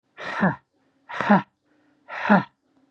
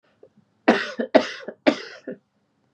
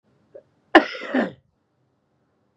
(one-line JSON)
{"exhalation_length": "2.9 s", "exhalation_amplitude": 27948, "exhalation_signal_mean_std_ratio": 0.37, "three_cough_length": "2.7 s", "three_cough_amplitude": 32428, "three_cough_signal_mean_std_ratio": 0.31, "cough_length": "2.6 s", "cough_amplitude": 32767, "cough_signal_mean_std_ratio": 0.23, "survey_phase": "beta (2021-08-13 to 2022-03-07)", "age": "45-64", "gender": "Male", "wearing_mask": "No", "symptom_cough_any": true, "symptom_sore_throat": true, "symptom_fatigue": true, "smoker_status": "Ex-smoker", "respiratory_condition_asthma": false, "respiratory_condition_other": false, "recruitment_source": "Test and Trace", "submission_delay": "2 days", "covid_test_result": "Positive", "covid_test_method": "RT-qPCR"}